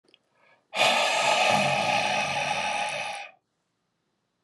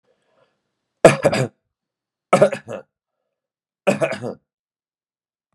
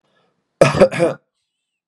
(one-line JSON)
{"exhalation_length": "4.4 s", "exhalation_amplitude": 14718, "exhalation_signal_mean_std_ratio": 0.68, "three_cough_length": "5.5 s", "three_cough_amplitude": 32768, "three_cough_signal_mean_std_ratio": 0.27, "cough_length": "1.9 s", "cough_amplitude": 32768, "cough_signal_mean_std_ratio": 0.35, "survey_phase": "beta (2021-08-13 to 2022-03-07)", "age": "45-64", "gender": "Male", "wearing_mask": "No", "symptom_cough_any": true, "smoker_status": "Never smoked", "respiratory_condition_asthma": false, "respiratory_condition_other": false, "recruitment_source": "REACT", "submission_delay": "1 day", "covid_test_result": "Negative", "covid_test_method": "RT-qPCR"}